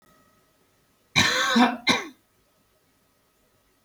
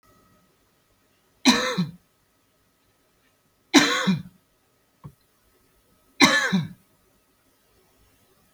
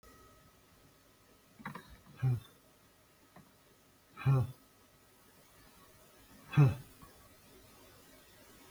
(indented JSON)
{
  "cough_length": "3.8 s",
  "cough_amplitude": 18804,
  "cough_signal_mean_std_ratio": 0.35,
  "three_cough_length": "8.5 s",
  "three_cough_amplitude": 31870,
  "three_cough_signal_mean_std_ratio": 0.29,
  "exhalation_length": "8.7 s",
  "exhalation_amplitude": 5031,
  "exhalation_signal_mean_std_ratio": 0.27,
  "survey_phase": "beta (2021-08-13 to 2022-03-07)",
  "age": "45-64",
  "gender": "Male",
  "wearing_mask": "No",
  "symptom_none": true,
  "smoker_status": "Ex-smoker",
  "respiratory_condition_asthma": false,
  "respiratory_condition_other": false,
  "recruitment_source": "REACT",
  "submission_delay": "1 day",
  "covid_test_result": "Negative",
  "covid_test_method": "RT-qPCR",
  "influenza_a_test_result": "Negative",
  "influenza_b_test_result": "Negative"
}